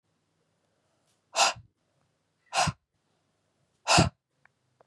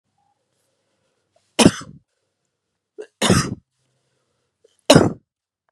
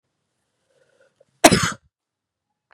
{"exhalation_length": "4.9 s", "exhalation_amplitude": 13494, "exhalation_signal_mean_std_ratio": 0.26, "three_cough_length": "5.7 s", "three_cough_amplitude": 32768, "three_cough_signal_mean_std_ratio": 0.24, "cough_length": "2.7 s", "cough_amplitude": 32768, "cough_signal_mean_std_ratio": 0.2, "survey_phase": "beta (2021-08-13 to 2022-03-07)", "age": "18-44", "gender": "Female", "wearing_mask": "No", "symptom_runny_or_blocked_nose": true, "symptom_fatigue": true, "symptom_headache": true, "symptom_change_to_sense_of_smell_or_taste": true, "symptom_other": true, "symptom_onset": "3 days", "smoker_status": "Never smoked", "respiratory_condition_asthma": false, "respiratory_condition_other": false, "recruitment_source": "Test and Trace", "submission_delay": "1 day", "covid_test_result": "Positive", "covid_test_method": "RT-qPCR", "covid_ct_value": 16.2, "covid_ct_gene": "ORF1ab gene", "covid_ct_mean": 17.6, "covid_viral_load": "1600000 copies/ml", "covid_viral_load_category": "High viral load (>1M copies/ml)"}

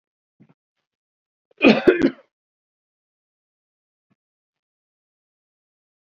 {"cough_length": "6.1 s", "cough_amplitude": 31567, "cough_signal_mean_std_ratio": 0.18, "survey_phase": "beta (2021-08-13 to 2022-03-07)", "age": "65+", "gender": "Male", "wearing_mask": "No", "symptom_abdominal_pain": true, "symptom_onset": "10 days", "smoker_status": "Never smoked", "respiratory_condition_asthma": false, "respiratory_condition_other": false, "recruitment_source": "REACT", "submission_delay": "2 days", "covid_test_result": "Negative", "covid_test_method": "RT-qPCR", "influenza_a_test_result": "Negative", "influenza_b_test_result": "Negative"}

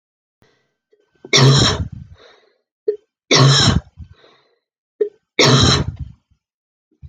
{"three_cough_length": "7.1 s", "three_cough_amplitude": 32768, "three_cough_signal_mean_std_ratio": 0.41, "survey_phase": "alpha (2021-03-01 to 2021-08-12)", "age": "45-64", "gender": "Female", "wearing_mask": "No", "symptom_none": true, "symptom_onset": "3 days", "smoker_status": "Never smoked", "respiratory_condition_asthma": false, "respiratory_condition_other": false, "recruitment_source": "REACT", "submission_delay": "3 days", "covid_test_result": "Negative", "covid_test_method": "RT-qPCR"}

